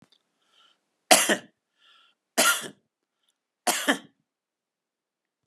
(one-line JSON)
{"three_cough_length": "5.5 s", "three_cough_amplitude": 31412, "three_cough_signal_mean_std_ratio": 0.26, "survey_phase": "beta (2021-08-13 to 2022-03-07)", "age": "45-64", "gender": "Male", "wearing_mask": "No", "symptom_none": true, "smoker_status": "Never smoked", "respiratory_condition_asthma": false, "respiratory_condition_other": false, "recruitment_source": "REACT", "submission_delay": "1 day", "covid_test_result": "Negative", "covid_test_method": "RT-qPCR"}